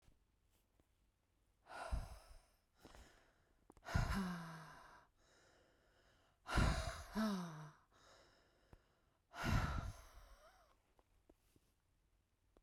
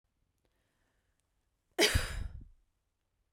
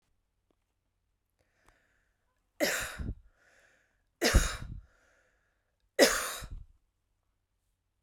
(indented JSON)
{
  "exhalation_length": "12.6 s",
  "exhalation_amplitude": 2329,
  "exhalation_signal_mean_std_ratio": 0.38,
  "cough_length": "3.3 s",
  "cough_amplitude": 6980,
  "cough_signal_mean_std_ratio": 0.27,
  "three_cough_length": "8.0 s",
  "three_cough_amplitude": 14420,
  "three_cough_signal_mean_std_ratio": 0.27,
  "survey_phase": "beta (2021-08-13 to 2022-03-07)",
  "age": "18-44",
  "gender": "Female",
  "wearing_mask": "No",
  "symptom_none": true,
  "smoker_status": "Current smoker (1 to 10 cigarettes per day)",
  "respiratory_condition_asthma": false,
  "respiratory_condition_other": false,
  "recruitment_source": "REACT",
  "submission_delay": "4 days",
  "covid_test_result": "Negative",
  "covid_test_method": "RT-qPCR",
  "influenza_a_test_result": "Negative",
  "influenza_b_test_result": "Negative"
}